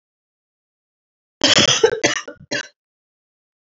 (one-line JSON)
{"cough_length": "3.7 s", "cough_amplitude": 29280, "cough_signal_mean_std_ratio": 0.34, "survey_phase": "beta (2021-08-13 to 2022-03-07)", "age": "18-44", "gender": "Female", "wearing_mask": "No", "symptom_cough_any": true, "symptom_runny_or_blocked_nose": true, "symptom_fever_high_temperature": true, "symptom_headache": true, "symptom_loss_of_taste": true, "smoker_status": "Never smoked", "respiratory_condition_asthma": false, "respiratory_condition_other": false, "recruitment_source": "Test and Trace", "submission_delay": "3 days", "covid_test_result": "Positive", "covid_test_method": "RT-qPCR", "covid_ct_value": 32.4, "covid_ct_gene": "ORF1ab gene", "covid_ct_mean": 33.5, "covid_viral_load": "10 copies/ml", "covid_viral_load_category": "Minimal viral load (< 10K copies/ml)"}